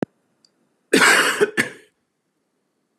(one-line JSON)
{"cough_length": "3.0 s", "cough_amplitude": 27241, "cough_signal_mean_std_ratio": 0.37, "survey_phase": "beta (2021-08-13 to 2022-03-07)", "age": "45-64", "gender": "Male", "wearing_mask": "No", "symptom_none": true, "smoker_status": "Never smoked", "respiratory_condition_asthma": false, "respiratory_condition_other": false, "recruitment_source": "REACT", "submission_delay": "1 day", "covid_test_result": "Negative", "covid_test_method": "RT-qPCR", "influenza_a_test_result": "Negative", "influenza_b_test_result": "Negative"}